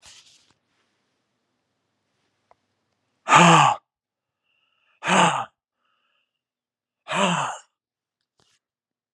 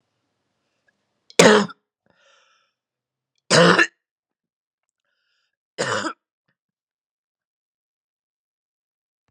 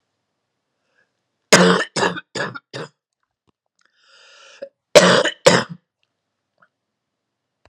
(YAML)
exhalation_length: 9.1 s
exhalation_amplitude: 31704
exhalation_signal_mean_std_ratio: 0.27
three_cough_length: 9.3 s
three_cough_amplitude: 32768
three_cough_signal_mean_std_ratio: 0.22
cough_length: 7.7 s
cough_amplitude: 32768
cough_signal_mean_std_ratio: 0.29
survey_phase: beta (2021-08-13 to 2022-03-07)
age: 45-64
gender: Male
wearing_mask: 'No'
symptom_cough_any: true
symptom_runny_or_blocked_nose: true
symptom_shortness_of_breath: true
symptom_change_to_sense_of_smell_or_taste: true
symptom_onset: 10 days
smoker_status: Ex-smoker
respiratory_condition_asthma: false
respiratory_condition_other: false
recruitment_source: Test and Trace
submission_delay: 2 days
covid_test_result: Positive
covid_test_method: RT-qPCR